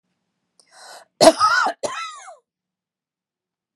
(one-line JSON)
{"cough_length": "3.8 s", "cough_amplitude": 32768, "cough_signal_mean_std_ratio": 0.3, "survey_phase": "beta (2021-08-13 to 2022-03-07)", "age": "45-64", "gender": "Female", "wearing_mask": "No", "symptom_none": true, "smoker_status": "Never smoked", "respiratory_condition_asthma": false, "respiratory_condition_other": false, "recruitment_source": "REACT", "submission_delay": "2 days", "covid_test_result": "Negative", "covid_test_method": "RT-qPCR", "influenza_a_test_result": "Negative", "influenza_b_test_result": "Negative"}